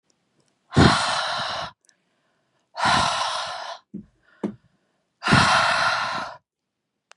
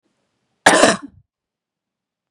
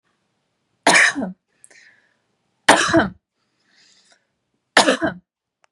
{
  "exhalation_length": "7.2 s",
  "exhalation_amplitude": 27972,
  "exhalation_signal_mean_std_ratio": 0.49,
  "cough_length": "2.3 s",
  "cough_amplitude": 32768,
  "cough_signal_mean_std_ratio": 0.28,
  "three_cough_length": "5.7 s",
  "three_cough_amplitude": 32768,
  "three_cough_signal_mean_std_ratio": 0.32,
  "survey_phase": "beta (2021-08-13 to 2022-03-07)",
  "age": "18-44",
  "gender": "Female",
  "wearing_mask": "No",
  "symptom_cough_any": true,
  "symptom_runny_or_blocked_nose": true,
  "symptom_sore_throat": true,
  "symptom_onset": "12 days",
  "smoker_status": "Current smoker (1 to 10 cigarettes per day)",
  "respiratory_condition_asthma": false,
  "respiratory_condition_other": false,
  "recruitment_source": "REACT",
  "submission_delay": "1 day",
  "covid_test_result": "Negative",
  "covid_test_method": "RT-qPCR",
  "influenza_a_test_result": "Unknown/Void",
  "influenza_b_test_result": "Unknown/Void"
}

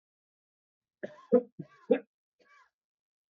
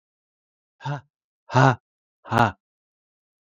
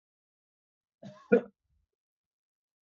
{
  "three_cough_length": "3.3 s",
  "three_cough_amplitude": 8526,
  "three_cough_signal_mean_std_ratio": 0.19,
  "exhalation_length": "3.4 s",
  "exhalation_amplitude": 31970,
  "exhalation_signal_mean_std_ratio": 0.26,
  "cough_length": "2.8 s",
  "cough_amplitude": 9979,
  "cough_signal_mean_std_ratio": 0.15,
  "survey_phase": "beta (2021-08-13 to 2022-03-07)",
  "age": "45-64",
  "gender": "Male",
  "wearing_mask": "No",
  "symptom_none": true,
  "smoker_status": "Never smoked",
  "respiratory_condition_asthma": false,
  "respiratory_condition_other": false,
  "recruitment_source": "REACT",
  "submission_delay": "1 day",
  "covid_test_result": "Negative",
  "covid_test_method": "RT-qPCR",
  "influenza_a_test_result": "Unknown/Void",
  "influenza_b_test_result": "Unknown/Void"
}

